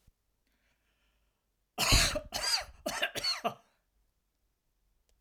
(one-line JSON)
{"cough_length": "5.2 s", "cough_amplitude": 9492, "cough_signal_mean_std_ratio": 0.37, "survey_phase": "alpha (2021-03-01 to 2021-08-12)", "age": "65+", "gender": "Male", "wearing_mask": "No", "symptom_none": true, "smoker_status": "Never smoked", "respiratory_condition_asthma": false, "respiratory_condition_other": false, "recruitment_source": "REACT", "submission_delay": "1 day", "covid_test_result": "Negative", "covid_test_method": "RT-qPCR"}